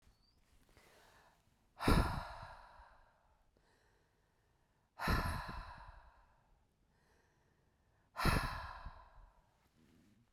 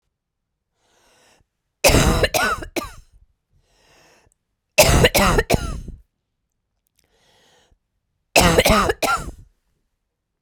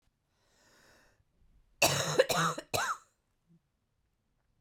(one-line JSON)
{"exhalation_length": "10.3 s", "exhalation_amplitude": 4903, "exhalation_signal_mean_std_ratio": 0.32, "three_cough_length": "10.4 s", "three_cough_amplitude": 32768, "three_cough_signal_mean_std_ratio": 0.38, "cough_length": "4.6 s", "cough_amplitude": 11204, "cough_signal_mean_std_ratio": 0.34, "survey_phase": "beta (2021-08-13 to 2022-03-07)", "age": "45-64", "gender": "Female", "wearing_mask": "No", "symptom_cough_any": true, "symptom_runny_or_blocked_nose": true, "symptom_shortness_of_breath": true, "symptom_fatigue": true, "symptom_headache": true, "symptom_change_to_sense_of_smell_or_taste": true, "symptom_loss_of_taste": true, "symptom_onset": "5 days", "smoker_status": "Ex-smoker", "respiratory_condition_asthma": true, "respiratory_condition_other": false, "recruitment_source": "Test and Trace", "submission_delay": "1 day", "covid_test_result": "Positive", "covid_test_method": "RT-qPCR"}